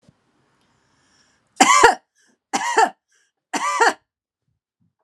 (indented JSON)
{
  "three_cough_length": "5.0 s",
  "three_cough_amplitude": 32767,
  "three_cough_signal_mean_std_ratio": 0.33,
  "survey_phase": "alpha (2021-03-01 to 2021-08-12)",
  "age": "45-64",
  "gender": "Female",
  "wearing_mask": "No",
  "symptom_headache": true,
  "smoker_status": "Ex-smoker",
  "respiratory_condition_asthma": true,
  "respiratory_condition_other": false,
  "recruitment_source": "REACT",
  "submission_delay": "2 days",
  "covid_test_result": "Negative",
  "covid_test_method": "RT-qPCR"
}